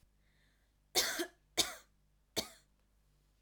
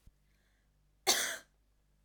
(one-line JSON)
{"three_cough_length": "3.4 s", "three_cough_amplitude": 5133, "three_cough_signal_mean_std_ratio": 0.3, "cough_length": "2.0 s", "cough_amplitude": 7740, "cough_signal_mean_std_ratio": 0.29, "survey_phase": "alpha (2021-03-01 to 2021-08-12)", "age": "18-44", "gender": "Female", "wearing_mask": "No", "symptom_none": true, "smoker_status": "Never smoked", "respiratory_condition_asthma": false, "respiratory_condition_other": false, "recruitment_source": "REACT", "submission_delay": "1 day", "covid_test_result": "Negative", "covid_test_method": "RT-qPCR"}